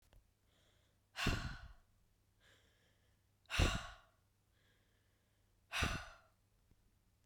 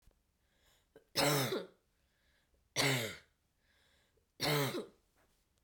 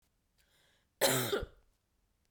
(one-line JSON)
{"exhalation_length": "7.3 s", "exhalation_amplitude": 3545, "exhalation_signal_mean_std_ratio": 0.3, "three_cough_length": "5.6 s", "three_cough_amplitude": 4013, "three_cough_signal_mean_std_ratio": 0.39, "cough_length": "2.3 s", "cough_amplitude": 5747, "cough_signal_mean_std_ratio": 0.34, "survey_phase": "beta (2021-08-13 to 2022-03-07)", "age": "18-44", "gender": "Female", "wearing_mask": "No", "symptom_cough_any": true, "symptom_sore_throat": true, "symptom_loss_of_taste": true, "smoker_status": "Never smoked", "respiratory_condition_asthma": false, "respiratory_condition_other": false, "recruitment_source": "Test and Trace", "submission_delay": "1 day", "covid_test_result": "Positive", "covid_test_method": "RT-qPCR", "covid_ct_value": 17.9, "covid_ct_gene": "ORF1ab gene"}